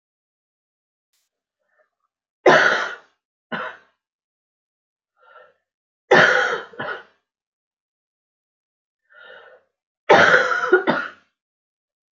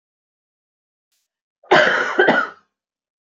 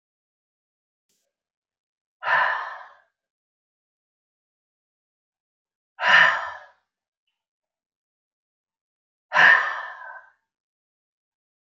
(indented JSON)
{
  "three_cough_length": "12.1 s",
  "three_cough_amplitude": 28656,
  "three_cough_signal_mean_std_ratio": 0.3,
  "cough_length": "3.2 s",
  "cough_amplitude": 28169,
  "cough_signal_mean_std_ratio": 0.37,
  "exhalation_length": "11.6 s",
  "exhalation_amplitude": 21938,
  "exhalation_signal_mean_std_ratio": 0.25,
  "survey_phase": "beta (2021-08-13 to 2022-03-07)",
  "age": "45-64",
  "gender": "Female",
  "wearing_mask": "No",
  "symptom_new_continuous_cough": true,
  "symptom_onset": "8 days",
  "smoker_status": "Ex-smoker",
  "respiratory_condition_asthma": false,
  "respiratory_condition_other": false,
  "recruitment_source": "REACT",
  "submission_delay": "1 day",
  "covid_test_result": "Negative",
  "covid_test_method": "RT-qPCR"
}